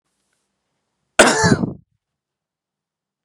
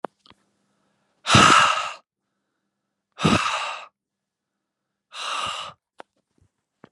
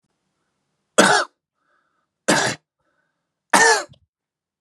{"cough_length": "3.2 s", "cough_amplitude": 32768, "cough_signal_mean_std_ratio": 0.28, "exhalation_length": "6.9 s", "exhalation_amplitude": 28792, "exhalation_signal_mean_std_ratio": 0.33, "three_cough_length": "4.6 s", "three_cough_amplitude": 32768, "three_cough_signal_mean_std_ratio": 0.32, "survey_phase": "beta (2021-08-13 to 2022-03-07)", "age": "18-44", "gender": "Male", "wearing_mask": "No", "symptom_none": true, "smoker_status": "Never smoked", "respiratory_condition_asthma": false, "respiratory_condition_other": false, "recruitment_source": "REACT", "submission_delay": "2 days", "covid_test_result": "Negative", "covid_test_method": "RT-qPCR", "influenza_a_test_result": "Negative", "influenza_b_test_result": "Negative"}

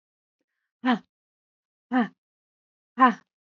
{"exhalation_length": "3.6 s", "exhalation_amplitude": 21349, "exhalation_signal_mean_std_ratio": 0.26, "survey_phase": "beta (2021-08-13 to 2022-03-07)", "age": "45-64", "gender": "Female", "wearing_mask": "No", "symptom_none": true, "smoker_status": "Never smoked", "respiratory_condition_asthma": false, "respiratory_condition_other": false, "recruitment_source": "REACT", "submission_delay": "2 days", "covid_test_result": "Negative", "covid_test_method": "RT-qPCR", "influenza_a_test_result": "Negative", "influenza_b_test_result": "Negative"}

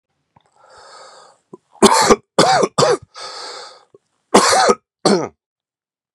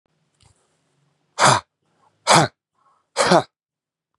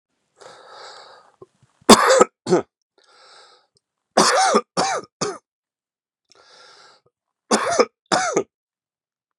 {"cough_length": "6.1 s", "cough_amplitude": 32768, "cough_signal_mean_std_ratio": 0.41, "exhalation_length": "4.2 s", "exhalation_amplitude": 31642, "exhalation_signal_mean_std_ratio": 0.3, "three_cough_length": "9.4 s", "three_cough_amplitude": 32768, "three_cough_signal_mean_std_ratio": 0.33, "survey_phase": "beta (2021-08-13 to 2022-03-07)", "age": "18-44", "gender": "Male", "wearing_mask": "No", "symptom_cough_any": true, "symptom_runny_or_blocked_nose": true, "symptom_shortness_of_breath": true, "symptom_fatigue": true, "symptom_headache": true, "smoker_status": "Ex-smoker", "respiratory_condition_asthma": false, "respiratory_condition_other": false, "recruitment_source": "Test and Trace", "submission_delay": "1 day", "covid_test_result": "Positive", "covid_test_method": "LFT"}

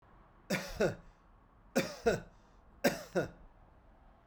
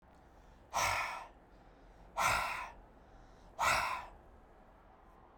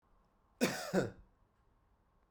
{"three_cough_length": "4.3 s", "three_cough_amplitude": 7069, "three_cough_signal_mean_std_ratio": 0.4, "exhalation_length": "5.4 s", "exhalation_amplitude": 4000, "exhalation_signal_mean_std_ratio": 0.49, "cough_length": "2.3 s", "cough_amplitude": 4510, "cough_signal_mean_std_ratio": 0.34, "survey_phase": "beta (2021-08-13 to 2022-03-07)", "age": "45-64", "gender": "Male", "wearing_mask": "No", "symptom_change_to_sense_of_smell_or_taste": true, "symptom_onset": "7 days", "smoker_status": "Ex-smoker", "respiratory_condition_asthma": false, "respiratory_condition_other": false, "recruitment_source": "Test and Trace", "submission_delay": "0 days", "covid_test_method": "RT-qPCR", "covid_ct_value": 33.3, "covid_ct_gene": "ORF1ab gene", "covid_ct_mean": 34.2, "covid_viral_load": "6 copies/ml", "covid_viral_load_category": "Minimal viral load (< 10K copies/ml)"}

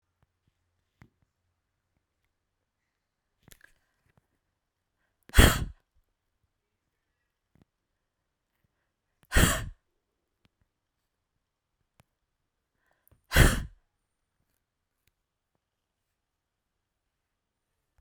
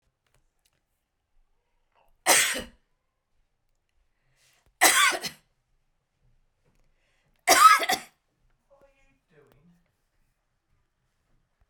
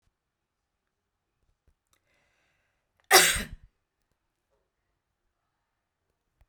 {"exhalation_length": "18.0 s", "exhalation_amplitude": 26435, "exhalation_signal_mean_std_ratio": 0.15, "three_cough_length": "11.7 s", "three_cough_amplitude": 20241, "three_cough_signal_mean_std_ratio": 0.24, "cough_length": "6.5 s", "cough_amplitude": 23124, "cough_signal_mean_std_ratio": 0.16, "survey_phase": "beta (2021-08-13 to 2022-03-07)", "age": "45-64", "gender": "Female", "wearing_mask": "No", "symptom_none": true, "smoker_status": "Ex-smoker", "respiratory_condition_asthma": false, "respiratory_condition_other": false, "recruitment_source": "REACT", "submission_delay": "3 days", "covid_test_result": "Negative", "covid_test_method": "RT-qPCR"}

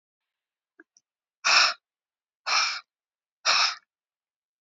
{"exhalation_length": "4.6 s", "exhalation_amplitude": 14834, "exhalation_signal_mean_std_ratio": 0.34, "survey_phase": "beta (2021-08-13 to 2022-03-07)", "age": "65+", "gender": "Female", "wearing_mask": "No", "symptom_cough_any": true, "symptom_runny_or_blocked_nose": true, "symptom_onset": "12 days", "smoker_status": "Ex-smoker", "respiratory_condition_asthma": false, "respiratory_condition_other": true, "recruitment_source": "REACT", "submission_delay": "1 day", "covid_test_result": "Negative", "covid_test_method": "RT-qPCR", "influenza_a_test_result": "Negative", "influenza_b_test_result": "Negative"}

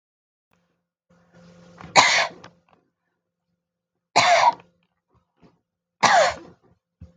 {"three_cough_length": "7.2 s", "three_cough_amplitude": 30563, "three_cough_signal_mean_std_ratio": 0.31, "survey_phase": "beta (2021-08-13 to 2022-03-07)", "age": "45-64", "gender": "Female", "wearing_mask": "No", "symptom_none": true, "smoker_status": "Ex-smoker", "respiratory_condition_asthma": false, "respiratory_condition_other": false, "recruitment_source": "REACT", "submission_delay": "1 day", "covid_test_result": "Negative", "covid_test_method": "RT-qPCR"}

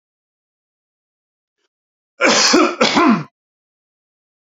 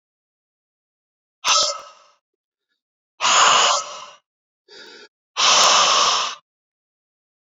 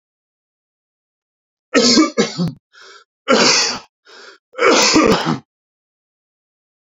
{"cough_length": "4.5 s", "cough_amplitude": 28847, "cough_signal_mean_std_ratio": 0.37, "exhalation_length": "7.5 s", "exhalation_amplitude": 27042, "exhalation_signal_mean_std_ratio": 0.43, "three_cough_length": "6.9 s", "three_cough_amplitude": 32767, "three_cough_signal_mean_std_ratio": 0.43, "survey_phase": "beta (2021-08-13 to 2022-03-07)", "age": "45-64", "gender": "Male", "wearing_mask": "No", "symptom_none": true, "smoker_status": "Ex-smoker", "respiratory_condition_asthma": false, "respiratory_condition_other": false, "recruitment_source": "REACT", "submission_delay": "2 days", "covid_test_result": "Negative", "covid_test_method": "RT-qPCR"}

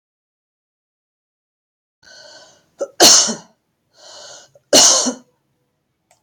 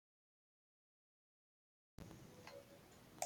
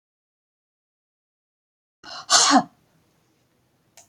{"three_cough_length": "6.2 s", "three_cough_amplitude": 32768, "three_cough_signal_mean_std_ratio": 0.28, "cough_length": "3.3 s", "cough_amplitude": 1486, "cough_signal_mean_std_ratio": 0.33, "exhalation_length": "4.1 s", "exhalation_amplitude": 29058, "exhalation_signal_mean_std_ratio": 0.24, "survey_phase": "beta (2021-08-13 to 2022-03-07)", "age": "65+", "gender": "Female", "wearing_mask": "No", "symptom_none": true, "smoker_status": "Never smoked", "respiratory_condition_asthma": false, "respiratory_condition_other": false, "recruitment_source": "REACT", "submission_delay": "7 days", "covid_test_result": "Negative", "covid_test_method": "RT-qPCR"}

